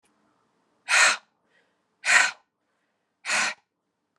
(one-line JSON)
{"exhalation_length": "4.2 s", "exhalation_amplitude": 18446, "exhalation_signal_mean_std_ratio": 0.33, "survey_phase": "alpha (2021-03-01 to 2021-08-12)", "age": "45-64", "gender": "Female", "wearing_mask": "No", "symptom_cough_any": true, "symptom_headache": true, "symptom_onset": "3 days", "smoker_status": "Ex-smoker", "respiratory_condition_asthma": false, "respiratory_condition_other": false, "recruitment_source": "Test and Trace", "submission_delay": "2 days", "covid_test_result": "Positive", "covid_test_method": "RT-qPCR", "covid_ct_value": 19.6, "covid_ct_gene": "ORF1ab gene", "covid_ct_mean": 20.9, "covid_viral_load": "140000 copies/ml", "covid_viral_load_category": "Low viral load (10K-1M copies/ml)"}